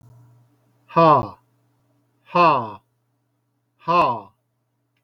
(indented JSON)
{
  "exhalation_length": "5.0 s",
  "exhalation_amplitude": 23626,
  "exhalation_signal_mean_std_ratio": 0.34,
  "survey_phase": "beta (2021-08-13 to 2022-03-07)",
  "age": "45-64",
  "gender": "Male",
  "wearing_mask": "No",
  "symptom_none": true,
  "smoker_status": "Never smoked",
  "respiratory_condition_asthma": false,
  "respiratory_condition_other": false,
  "recruitment_source": "REACT",
  "submission_delay": "1 day",
  "covid_test_result": "Negative",
  "covid_test_method": "RT-qPCR",
  "influenza_a_test_result": "Negative",
  "influenza_b_test_result": "Negative"
}